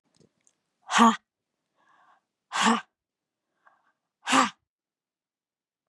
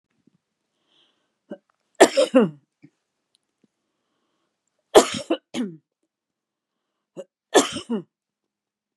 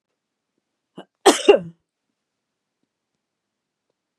{"exhalation_length": "5.9 s", "exhalation_amplitude": 18145, "exhalation_signal_mean_std_ratio": 0.26, "three_cough_length": "9.0 s", "three_cough_amplitude": 32767, "three_cough_signal_mean_std_ratio": 0.23, "cough_length": "4.2 s", "cough_amplitude": 32767, "cough_signal_mean_std_ratio": 0.18, "survey_phase": "beta (2021-08-13 to 2022-03-07)", "age": "65+", "gender": "Female", "wearing_mask": "No", "symptom_none": true, "smoker_status": "Never smoked", "respiratory_condition_asthma": false, "respiratory_condition_other": false, "recruitment_source": "REACT", "submission_delay": "1 day", "covid_test_result": "Negative", "covid_test_method": "RT-qPCR", "influenza_a_test_result": "Negative", "influenza_b_test_result": "Negative"}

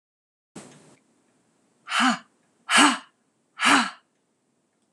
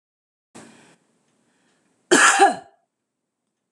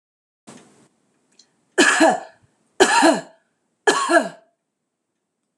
{"exhalation_length": "4.9 s", "exhalation_amplitude": 25361, "exhalation_signal_mean_std_ratio": 0.32, "cough_length": "3.7 s", "cough_amplitude": 24200, "cough_signal_mean_std_ratio": 0.28, "three_cough_length": "5.6 s", "three_cough_amplitude": 26028, "three_cough_signal_mean_std_ratio": 0.37, "survey_phase": "beta (2021-08-13 to 2022-03-07)", "age": "45-64", "gender": "Female", "wearing_mask": "No", "symptom_none": true, "smoker_status": "Ex-smoker", "respiratory_condition_asthma": false, "respiratory_condition_other": false, "recruitment_source": "REACT", "submission_delay": "2 days", "covid_test_result": "Negative", "covid_test_method": "RT-qPCR", "influenza_a_test_result": "Negative", "influenza_b_test_result": "Negative"}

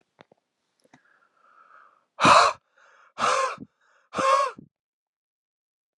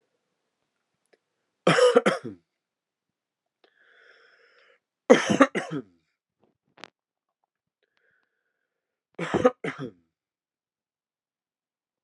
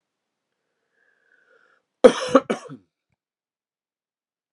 {"exhalation_length": "6.0 s", "exhalation_amplitude": 25676, "exhalation_signal_mean_std_ratio": 0.32, "three_cough_length": "12.0 s", "three_cough_amplitude": 29183, "three_cough_signal_mean_std_ratio": 0.23, "cough_length": "4.5 s", "cough_amplitude": 32768, "cough_signal_mean_std_ratio": 0.16, "survey_phase": "beta (2021-08-13 to 2022-03-07)", "age": "18-44", "gender": "Male", "wearing_mask": "No", "symptom_runny_or_blocked_nose": true, "smoker_status": "Ex-smoker", "respiratory_condition_asthma": false, "respiratory_condition_other": false, "recruitment_source": "Test and Trace", "submission_delay": "1 day", "covid_test_result": "Positive", "covid_test_method": "RT-qPCR", "covid_ct_value": 17.9, "covid_ct_gene": "ORF1ab gene"}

